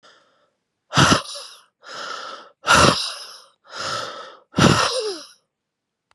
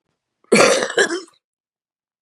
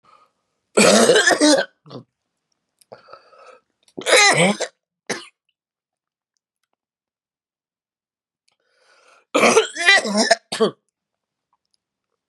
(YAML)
exhalation_length: 6.1 s
exhalation_amplitude: 30774
exhalation_signal_mean_std_ratio: 0.42
cough_length: 2.2 s
cough_amplitude: 32737
cough_signal_mean_std_ratio: 0.4
three_cough_length: 12.3 s
three_cough_amplitude: 32727
three_cough_signal_mean_std_ratio: 0.36
survey_phase: beta (2021-08-13 to 2022-03-07)
age: 18-44
gender: Female
wearing_mask: 'No'
symptom_cough_any: true
symptom_runny_or_blocked_nose: true
symptom_shortness_of_breath: true
symptom_sore_throat: true
symptom_diarrhoea: true
symptom_fatigue: true
symptom_headache: true
symptom_other: true
symptom_onset: 2 days
smoker_status: Never smoked
respiratory_condition_asthma: true
respiratory_condition_other: false
recruitment_source: Test and Trace
submission_delay: 1 day
covid_test_result: Positive
covid_test_method: RT-qPCR
covid_ct_value: 18.3
covid_ct_gene: N gene